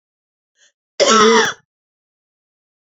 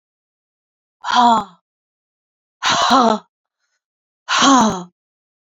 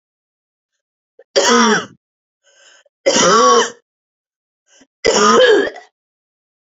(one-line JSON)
{"cough_length": "2.8 s", "cough_amplitude": 31322, "cough_signal_mean_std_ratio": 0.35, "exhalation_length": "5.5 s", "exhalation_amplitude": 32688, "exhalation_signal_mean_std_ratio": 0.41, "three_cough_length": "6.7 s", "three_cough_amplitude": 32767, "three_cough_signal_mean_std_ratio": 0.44, "survey_phase": "beta (2021-08-13 to 2022-03-07)", "age": "18-44", "gender": "Female", "wearing_mask": "No", "symptom_none": true, "symptom_onset": "8 days", "smoker_status": "Never smoked", "respiratory_condition_asthma": true, "respiratory_condition_other": false, "recruitment_source": "REACT", "submission_delay": "3 days", "covid_test_result": "Negative", "covid_test_method": "RT-qPCR", "influenza_a_test_result": "Negative", "influenza_b_test_result": "Negative"}